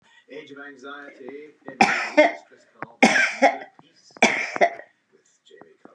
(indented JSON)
{
  "three_cough_length": "5.9 s",
  "three_cough_amplitude": 30586,
  "three_cough_signal_mean_std_ratio": 0.38,
  "survey_phase": "beta (2021-08-13 to 2022-03-07)",
  "age": "65+",
  "gender": "Female",
  "wearing_mask": "No",
  "symptom_none": true,
  "smoker_status": "Ex-smoker",
  "respiratory_condition_asthma": false,
  "respiratory_condition_other": false,
  "recruitment_source": "REACT",
  "submission_delay": "1 day",
  "covid_test_result": "Negative",
  "covid_test_method": "RT-qPCR",
  "influenza_a_test_result": "Negative",
  "influenza_b_test_result": "Negative"
}